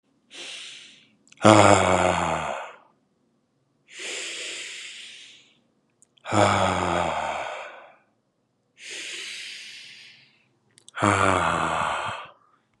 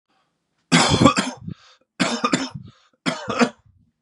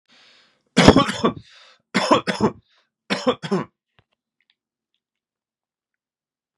{"exhalation_length": "12.8 s", "exhalation_amplitude": 32207, "exhalation_signal_mean_std_ratio": 0.43, "cough_length": "4.0 s", "cough_amplitude": 31934, "cough_signal_mean_std_ratio": 0.43, "three_cough_length": "6.6 s", "three_cough_amplitude": 32768, "three_cough_signal_mean_std_ratio": 0.3, "survey_phase": "beta (2021-08-13 to 2022-03-07)", "age": "18-44", "gender": "Male", "wearing_mask": "No", "symptom_runny_or_blocked_nose": true, "symptom_sore_throat": true, "symptom_fatigue": true, "symptom_fever_high_temperature": true, "symptom_headache": true, "symptom_onset": "3 days", "smoker_status": "Never smoked", "respiratory_condition_asthma": false, "respiratory_condition_other": false, "recruitment_source": "Test and Trace", "submission_delay": "1 day", "covid_test_result": "Positive", "covid_test_method": "RT-qPCR", "covid_ct_value": 17.3, "covid_ct_gene": "ORF1ab gene", "covid_ct_mean": 18.3, "covid_viral_load": "970000 copies/ml", "covid_viral_load_category": "Low viral load (10K-1M copies/ml)"}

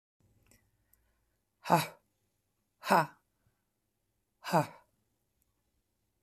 {"exhalation_length": "6.2 s", "exhalation_amplitude": 9955, "exhalation_signal_mean_std_ratio": 0.21, "survey_phase": "beta (2021-08-13 to 2022-03-07)", "age": "45-64", "gender": "Female", "wearing_mask": "No", "symptom_cough_any": true, "symptom_new_continuous_cough": true, "symptom_sore_throat": true, "smoker_status": "Ex-smoker", "respiratory_condition_asthma": false, "respiratory_condition_other": false, "recruitment_source": "Test and Trace", "submission_delay": "1 day", "covid_test_result": "Negative", "covid_test_method": "RT-qPCR"}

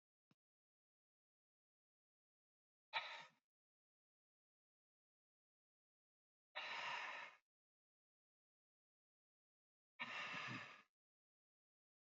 {"exhalation_length": "12.1 s", "exhalation_amplitude": 1040, "exhalation_signal_mean_std_ratio": 0.3, "survey_phase": "alpha (2021-03-01 to 2021-08-12)", "age": "18-44", "gender": "Male", "wearing_mask": "No", "symptom_none": true, "symptom_onset": "8 days", "smoker_status": "Never smoked", "respiratory_condition_asthma": false, "respiratory_condition_other": false, "recruitment_source": "REACT", "submission_delay": "1 day", "covid_test_result": "Negative", "covid_test_method": "RT-qPCR"}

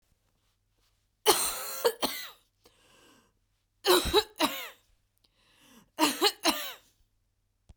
{"three_cough_length": "7.8 s", "three_cough_amplitude": 13875, "three_cough_signal_mean_std_ratio": 0.36, "survey_phase": "beta (2021-08-13 to 2022-03-07)", "age": "45-64", "gender": "Female", "wearing_mask": "No", "symptom_cough_any": true, "symptom_runny_or_blocked_nose": true, "symptom_sore_throat": true, "symptom_fatigue": true, "symptom_fever_high_temperature": true, "symptom_headache": true, "symptom_other": true, "smoker_status": "Never smoked", "respiratory_condition_asthma": false, "respiratory_condition_other": false, "recruitment_source": "Test and Trace", "submission_delay": "2 days", "covid_test_result": "Positive", "covid_test_method": "LFT"}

